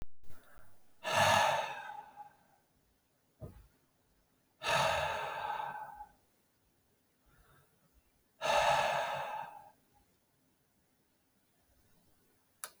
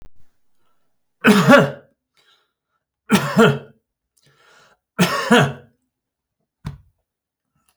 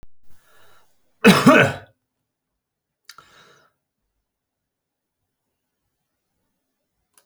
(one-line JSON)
{"exhalation_length": "12.8 s", "exhalation_amplitude": 5029, "exhalation_signal_mean_std_ratio": 0.43, "three_cough_length": "7.8 s", "three_cough_amplitude": 32767, "three_cough_signal_mean_std_ratio": 0.33, "cough_length": "7.3 s", "cough_amplitude": 29416, "cough_signal_mean_std_ratio": 0.21, "survey_phase": "alpha (2021-03-01 to 2021-08-12)", "age": "65+", "gender": "Male", "wearing_mask": "No", "symptom_none": true, "smoker_status": "Current smoker (11 or more cigarettes per day)", "respiratory_condition_asthma": false, "respiratory_condition_other": false, "recruitment_source": "REACT", "submission_delay": "2 days", "covid_test_result": "Negative", "covid_test_method": "RT-qPCR"}